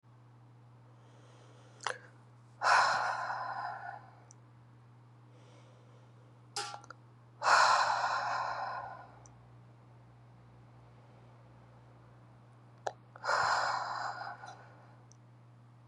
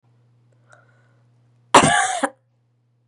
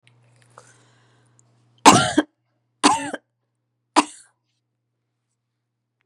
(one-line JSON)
{"exhalation_length": "15.9 s", "exhalation_amplitude": 7017, "exhalation_signal_mean_std_ratio": 0.43, "cough_length": "3.1 s", "cough_amplitude": 32768, "cough_signal_mean_std_ratio": 0.29, "three_cough_length": "6.1 s", "three_cough_amplitude": 32768, "three_cough_signal_mean_std_ratio": 0.22, "survey_phase": "beta (2021-08-13 to 2022-03-07)", "age": "18-44", "gender": "Female", "wearing_mask": "No", "symptom_runny_or_blocked_nose": true, "symptom_fatigue": true, "symptom_headache": true, "symptom_change_to_sense_of_smell_or_taste": true, "smoker_status": "Never smoked", "respiratory_condition_asthma": false, "respiratory_condition_other": false, "recruitment_source": "Test and Trace", "submission_delay": "7 days", "covid_test_result": "Positive", "covid_test_method": "RT-qPCR"}